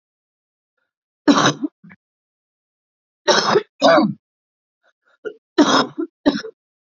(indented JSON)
{
  "three_cough_length": "6.9 s",
  "three_cough_amplitude": 29615,
  "three_cough_signal_mean_std_ratio": 0.36,
  "survey_phase": "beta (2021-08-13 to 2022-03-07)",
  "age": "18-44",
  "gender": "Female",
  "wearing_mask": "No",
  "symptom_cough_any": true,
  "symptom_runny_or_blocked_nose": true,
  "symptom_sore_throat": true,
  "symptom_onset": "6 days",
  "smoker_status": "Prefer not to say",
  "respiratory_condition_asthma": false,
  "respiratory_condition_other": false,
  "recruitment_source": "REACT",
  "submission_delay": "1 day",
  "covid_test_result": "Negative",
  "covid_test_method": "RT-qPCR",
  "influenza_a_test_result": "Negative",
  "influenza_b_test_result": "Negative"
}